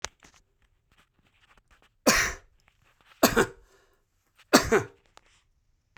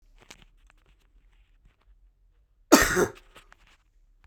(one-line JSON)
{"three_cough_length": "6.0 s", "three_cough_amplitude": 25881, "three_cough_signal_mean_std_ratio": 0.26, "cough_length": "4.3 s", "cough_amplitude": 25844, "cough_signal_mean_std_ratio": 0.22, "survey_phase": "beta (2021-08-13 to 2022-03-07)", "age": "18-44", "gender": "Male", "wearing_mask": "No", "symptom_none": true, "smoker_status": "Ex-smoker", "respiratory_condition_asthma": true, "respiratory_condition_other": false, "recruitment_source": "REACT", "submission_delay": "1 day", "covid_test_result": "Negative", "covid_test_method": "RT-qPCR"}